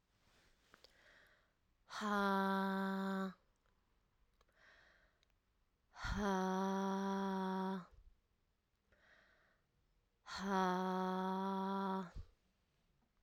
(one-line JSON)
{"exhalation_length": "13.2 s", "exhalation_amplitude": 1862, "exhalation_signal_mean_std_ratio": 0.59, "survey_phase": "alpha (2021-03-01 to 2021-08-12)", "age": "45-64", "gender": "Female", "wearing_mask": "No", "symptom_cough_any": true, "symptom_abdominal_pain": true, "symptom_fever_high_temperature": true, "symptom_headache": true, "symptom_change_to_sense_of_smell_or_taste": true, "symptom_loss_of_taste": true, "symptom_onset": "7 days", "smoker_status": "Never smoked", "respiratory_condition_asthma": false, "respiratory_condition_other": false, "recruitment_source": "Test and Trace", "submission_delay": "1 day", "covid_test_result": "Positive", "covid_test_method": "RT-qPCR"}